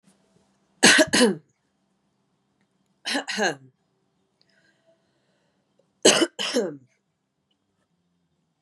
{"three_cough_length": "8.6 s", "three_cough_amplitude": 29293, "three_cough_signal_mean_std_ratio": 0.28, "survey_phase": "beta (2021-08-13 to 2022-03-07)", "age": "18-44", "gender": "Female", "wearing_mask": "No", "symptom_cough_any": true, "symptom_runny_or_blocked_nose": true, "symptom_change_to_sense_of_smell_or_taste": true, "symptom_onset": "4 days", "smoker_status": "Never smoked", "respiratory_condition_asthma": true, "respiratory_condition_other": false, "recruitment_source": "Test and Trace", "submission_delay": "2 days", "covid_test_result": "Positive", "covid_test_method": "RT-qPCR", "covid_ct_value": 23.0, "covid_ct_gene": "N gene"}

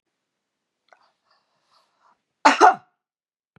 {"cough_length": "3.6 s", "cough_amplitude": 32413, "cough_signal_mean_std_ratio": 0.2, "survey_phase": "beta (2021-08-13 to 2022-03-07)", "age": "65+", "gender": "Female", "wearing_mask": "No", "symptom_none": true, "smoker_status": "Ex-smoker", "respiratory_condition_asthma": false, "respiratory_condition_other": false, "recruitment_source": "REACT", "submission_delay": "1 day", "covid_test_result": "Negative", "covid_test_method": "RT-qPCR", "influenza_a_test_result": "Negative", "influenza_b_test_result": "Negative"}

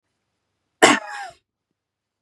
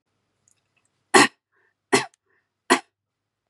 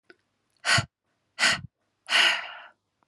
{"cough_length": "2.2 s", "cough_amplitude": 32767, "cough_signal_mean_std_ratio": 0.23, "three_cough_length": "3.5 s", "three_cough_amplitude": 31404, "three_cough_signal_mean_std_ratio": 0.22, "exhalation_length": "3.1 s", "exhalation_amplitude": 12800, "exhalation_signal_mean_std_ratio": 0.39, "survey_phase": "beta (2021-08-13 to 2022-03-07)", "age": "18-44", "gender": "Female", "wearing_mask": "No", "symptom_none": true, "symptom_onset": "2 days", "smoker_status": "Never smoked", "respiratory_condition_asthma": false, "respiratory_condition_other": false, "recruitment_source": "REACT", "submission_delay": "0 days", "covid_test_result": "Negative", "covid_test_method": "RT-qPCR", "influenza_a_test_result": "Negative", "influenza_b_test_result": "Negative"}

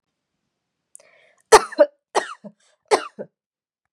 {"three_cough_length": "3.9 s", "three_cough_amplitude": 32768, "three_cough_signal_mean_std_ratio": 0.21, "survey_phase": "beta (2021-08-13 to 2022-03-07)", "age": "18-44", "gender": "Female", "wearing_mask": "No", "symptom_none": true, "smoker_status": "Never smoked", "respiratory_condition_asthma": false, "respiratory_condition_other": false, "recruitment_source": "REACT", "submission_delay": "0 days", "covid_test_result": "Negative", "covid_test_method": "RT-qPCR", "influenza_a_test_result": "Negative", "influenza_b_test_result": "Negative"}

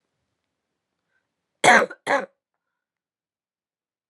{"cough_length": "4.1 s", "cough_amplitude": 25812, "cough_signal_mean_std_ratio": 0.22, "survey_phase": "alpha (2021-03-01 to 2021-08-12)", "age": "18-44", "gender": "Female", "wearing_mask": "No", "symptom_cough_any": true, "symptom_shortness_of_breath": true, "symptom_fever_high_temperature": true, "symptom_headache": true, "symptom_change_to_sense_of_smell_or_taste": true, "symptom_onset": "6 days", "smoker_status": "Never smoked", "respiratory_condition_asthma": false, "respiratory_condition_other": false, "recruitment_source": "Test and Trace", "submission_delay": "2 days", "covid_test_result": "Positive", "covid_test_method": "RT-qPCR"}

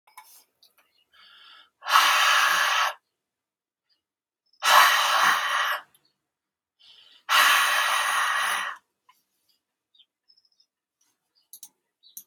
{"exhalation_length": "12.3 s", "exhalation_amplitude": 24903, "exhalation_signal_mean_std_ratio": 0.45, "survey_phase": "alpha (2021-03-01 to 2021-08-12)", "age": "45-64", "gender": "Male", "wearing_mask": "No", "symptom_none": true, "smoker_status": "Never smoked", "respiratory_condition_asthma": false, "respiratory_condition_other": false, "recruitment_source": "REACT", "submission_delay": "3 days", "covid_test_result": "Negative", "covid_test_method": "RT-qPCR"}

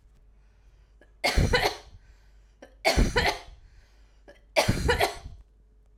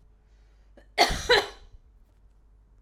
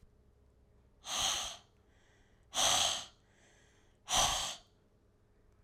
{"three_cough_length": "6.0 s", "three_cough_amplitude": 12587, "three_cough_signal_mean_std_ratio": 0.43, "cough_length": "2.8 s", "cough_amplitude": 16956, "cough_signal_mean_std_ratio": 0.31, "exhalation_length": "5.6 s", "exhalation_amplitude": 4956, "exhalation_signal_mean_std_ratio": 0.42, "survey_phase": "alpha (2021-03-01 to 2021-08-12)", "age": "18-44", "gender": "Female", "wearing_mask": "No", "symptom_none": true, "smoker_status": "Ex-smoker", "respiratory_condition_asthma": false, "respiratory_condition_other": false, "recruitment_source": "REACT", "submission_delay": "1 day", "covid_test_result": "Negative", "covid_test_method": "RT-qPCR"}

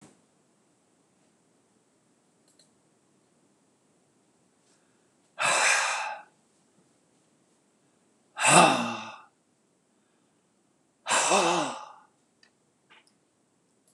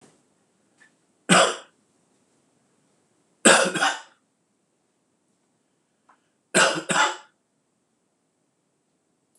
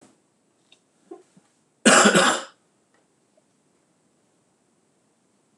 {"exhalation_length": "13.9 s", "exhalation_amplitude": 21677, "exhalation_signal_mean_std_ratio": 0.29, "three_cough_length": "9.4 s", "three_cough_amplitude": 25968, "three_cough_signal_mean_std_ratio": 0.27, "cough_length": "5.6 s", "cough_amplitude": 25547, "cough_signal_mean_std_ratio": 0.25, "survey_phase": "beta (2021-08-13 to 2022-03-07)", "age": "65+", "gender": "Male", "wearing_mask": "No", "symptom_cough_any": true, "symptom_new_continuous_cough": true, "symptom_fatigue": true, "symptom_other": true, "symptom_onset": "3 days", "smoker_status": "Never smoked", "respiratory_condition_asthma": false, "respiratory_condition_other": false, "recruitment_source": "Test and Trace", "submission_delay": "2 days", "covid_test_result": "Positive", "covid_test_method": "RT-qPCR", "covid_ct_value": 25.5, "covid_ct_gene": "ORF1ab gene"}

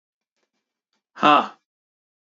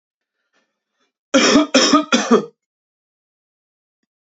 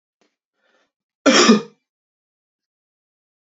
{"exhalation_length": "2.2 s", "exhalation_amplitude": 28634, "exhalation_signal_mean_std_ratio": 0.24, "three_cough_length": "4.3 s", "three_cough_amplitude": 31130, "three_cough_signal_mean_std_ratio": 0.37, "cough_length": "3.4 s", "cough_amplitude": 28351, "cough_signal_mean_std_ratio": 0.25, "survey_phase": "beta (2021-08-13 to 2022-03-07)", "age": "18-44", "gender": "Male", "wearing_mask": "No", "symptom_cough_any": true, "symptom_runny_or_blocked_nose": true, "symptom_sore_throat": true, "symptom_headache": true, "smoker_status": "Never smoked", "respiratory_condition_asthma": false, "respiratory_condition_other": false, "recruitment_source": "Test and Trace", "submission_delay": "2 days", "covid_test_result": "Positive", "covid_test_method": "ePCR"}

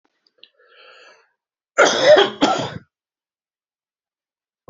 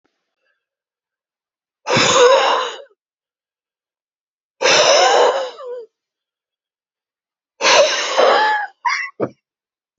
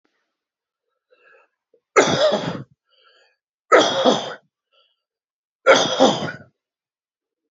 {"cough_length": "4.7 s", "cough_amplitude": 30763, "cough_signal_mean_std_ratio": 0.31, "exhalation_length": "10.0 s", "exhalation_amplitude": 32165, "exhalation_signal_mean_std_ratio": 0.46, "three_cough_length": "7.5 s", "three_cough_amplitude": 28089, "three_cough_signal_mean_std_ratio": 0.35, "survey_phase": "alpha (2021-03-01 to 2021-08-12)", "age": "65+", "gender": "Male", "wearing_mask": "No", "symptom_none": true, "smoker_status": "Ex-smoker", "respiratory_condition_asthma": true, "respiratory_condition_other": false, "recruitment_source": "REACT", "submission_delay": "2 days", "covid_test_result": "Negative", "covid_test_method": "RT-qPCR"}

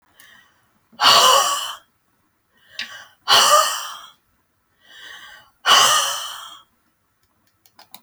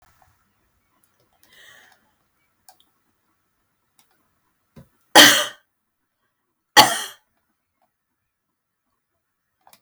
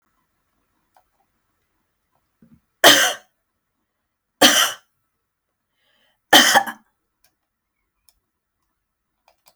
{"exhalation_length": "8.0 s", "exhalation_amplitude": 30639, "exhalation_signal_mean_std_ratio": 0.39, "cough_length": "9.8 s", "cough_amplitude": 32768, "cough_signal_mean_std_ratio": 0.17, "three_cough_length": "9.6 s", "three_cough_amplitude": 32768, "three_cough_signal_mean_std_ratio": 0.23, "survey_phase": "alpha (2021-03-01 to 2021-08-12)", "age": "65+", "gender": "Female", "wearing_mask": "No", "symptom_none": true, "smoker_status": "Ex-smoker", "respiratory_condition_asthma": false, "respiratory_condition_other": false, "recruitment_source": "REACT", "submission_delay": "3 days", "covid_test_result": "Negative", "covid_test_method": "RT-qPCR"}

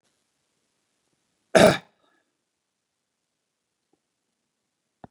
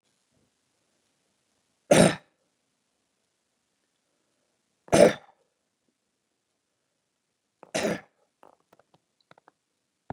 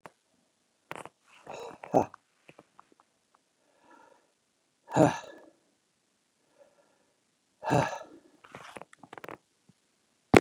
{"cough_length": "5.1 s", "cough_amplitude": 25762, "cough_signal_mean_std_ratio": 0.15, "three_cough_length": "10.1 s", "three_cough_amplitude": 21236, "three_cough_signal_mean_std_ratio": 0.18, "exhalation_length": "10.4 s", "exhalation_amplitude": 29102, "exhalation_signal_mean_std_ratio": 0.19, "survey_phase": "beta (2021-08-13 to 2022-03-07)", "age": "45-64", "gender": "Male", "wearing_mask": "No", "symptom_none": true, "smoker_status": "Ex-smoker", "respiratory_condition_asthma": false, "respiratory_condition_other": false, "recruitment_source": "REACT", "submission_delay": "5 days", "covid_test_result": "Positive", "covid_test_method": "RT-qPCR", "covid_ct_value": 33.0, "covid_ct_gene": "N gene", "influenza_a_test_result": "Negative", "influenza_b_test_result": "Negative"}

